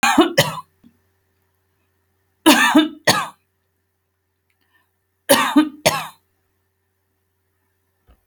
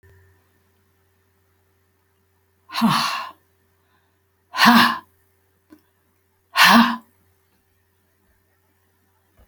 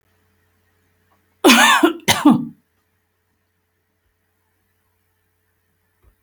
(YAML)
three_cough_length: 8.3 s
three_cough_amplitude: 32768
three_cough_signal_mean_std_ratio: 0.33
exhalation_length: 9.5 s
exhalation_amplitude: 29058
exhalation_signal_mean_std_ratio: 0.28
cough_length: 6.2 s
cough_amplitude: 32768
cough_signal_mean_std_ratio: 0.28
survey_phase: alpha (2021-03-01 to 2021-08-12)
age: 65+
gender: Female
wearing_mask: 'No'
symptom_none: true
smoker_status: Never smoked
respiratory_condition_asthma: false
respiratory_condition_other: false
recruitment_source: REACT
submission_delay: 2 days
covid_test_result: Negative
covid_test_method: RT-qPCR